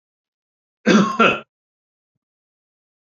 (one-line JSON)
{"cough_length": "3.1 s", "cough_amplitude": 27938, "cough_signal_mean_std_ratio": 0.3, "survey_phase": "beta (2021-08-13 to 2022-03-07)", "age": "65+", "gender": "Male", "wearing_mask": "No", "symptom_none": true, "smoker_status": "Ex-smoker", "respiratory_condition_asthma": false, "respiratory_condition_other": false, "recruitment_source": "REACT", "submission_delay": "2 days", "covid_test_result": "Negative", "covid_test_method": "RT-qPCR"}